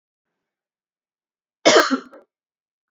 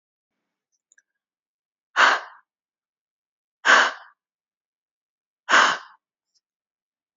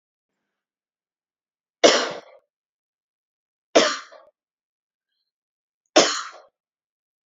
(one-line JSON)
{"cough_length": "2.9 s", "cough_amplitude": 27786, "cough_signal_mean_std_ratio": 0.25, "exhalation_length": "7.2 s", "exhalation_amplitude": 25758, "exhalation_signal_mean_std_ratio": 0.25, "three_cough_length": "7.3 s", "three_cough_amplitude": 29649, "three_cough_signal_mean_std_ratio": 0.22, "survey_phase": "beta (2021-08-13 to 2022-03-07)", "age": "18-44", "gender": "Female", "wearing_mask": "No", "symptom_runny_or_blocked_nose": true, "smoker_status": "Never smoked", "respiratory_condition_asthma": false, "respiratory_condition_other": false, "recruitment_source": "REACT", "submission_delay": "1 day", "covid_test_result": "Negative", "covid_test_method": "RT-qPCR", "influenza_a_test_result": "Negative", "influenza_b_test_result": "Negative"}